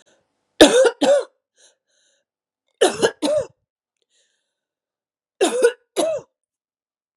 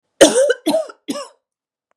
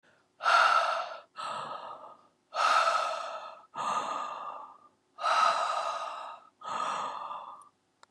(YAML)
three_cough_length: 7.2 s
three_cough_amplitude: 32768
three_cough_signal_mean_std_ratio: 0.34
cough_length: 2.0 s
cough_amplitude: 32768
cough_signal_mean_std_ratio: 0.42
exhalation_length: 8.1 s
exhalation_amplitude: 8715
exhalation_signal_mean_std_ratio: 0.61
survey_phase: beta (2021-08-13 to 2022-03-07)
age: 45-64
gender: Female
wearing_mask: 'No'
symptom_cough_any: true
symptom_new_continuous_cough: true
symptom_runny_or_blocked_nose: true
symptom_sore_throat: true
symptom_abdominal_pain: true
symptom_diarrhoea: true
symptom_fatigue: true
symptom_headache: true
smoker_status: Never smoked
respiratory_condition_asthma: false
respiratory_condition_other: false
recruitment_source: Test and Trace
submission_delay: 1 day
covid_test_result: Positive
covid_test_method: LFT